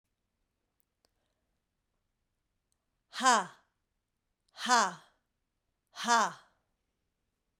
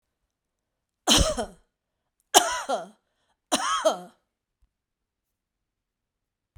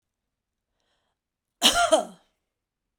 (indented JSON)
{
  "exhalation_length": "7.6 s",
  "exhalation_amplitude": 10013,
  "exhalation_signal_mean_std_ratio": 0.25,
  "three_cough_length": "6.6 s",
  "three_cough_amplitude": 32767,
  "three_cough_signal_mean_std_ratio": 0.3,
  "cough_length": "3.0 s",
  "cough_amplitude": 18825,
  "cough_signal_mean_std_ratio": 0.28,
  "survey_phase": "beta (2021-08-13 to 2022-03-07)",
  "age": "65+",
  "gender": "Female",
  "wearing_mask": "No",
  "symptom_runny_or_blocked_nose": true,
  "smoker_status": "Never smoked",
  "respiratory_condition_asthma": false,
  "respiratory_condition_other": false,
  "recruitment_source": "REACT",
  "submission_delay": "1 day",
  "covid_test_result": "Negative",
  "covid_test_method": "RT-qPCR"
}